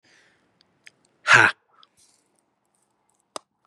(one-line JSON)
{"exhalation_length": "3.7 s", "exhalation_amplitude": 27754, "exhalation_signal_mean_std_ratio": 0.2, "survey_phase": "beta (2021-08-13 to 2022-03-07)", "age": "45-64", "gender": "Male", "wearing_mask": "No", "symptom_none": true, "symptom_onset": "12 days", "smoker_status": "Never smoked", "respiratory_condition_asthma": false, "respiratory_condition_other": false, "recruitment_source": "REACT", "submission_delay": "2 days", "covid_test_result": "Negative", "covid_test_method": "RT-qPCR", "influenza_a_test_result": "Negative", "influenza_b_test_result": "Negative"}